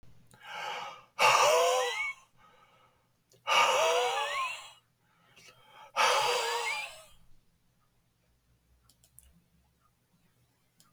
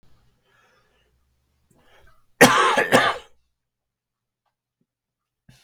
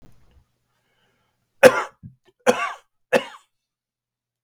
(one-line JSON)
{"exhalation_length": "10.9 s", "exhalation_amplitude": 10092, "exhalation_signal_mean_std_ratio": 0.45, "cough_length": "5.6 s", "cough_amplitude": 32768, "cough_signal_mean_std_ratio": 0.26, "three_cough_length": "4.4 s", "three_cough_amplitude": 32768, "three_cough_signal_mean_std_ratio": 0.21, "survey_phase": "beta (2021-08-13 to 2022-03-07)", "age": "65+", "gender": "Male", "wearing_mask": "No", "symptom_shortness_of_breath": true, "symptom_fatigue": true, "symptom_headache": true, "symptom_onset": "6 days", "smoker_status": "Never smoked", "respiratory_condition_asthma": false, "respiratory_condition_other": false, "recruitment_source": "REACT", "submission_delay": "0 days", "covid_test_result": "Negative", "covid_test_method": "RT-qPCR", "influenza_a_test_result": "Negative", "influenza_b_test_result": "Negative"}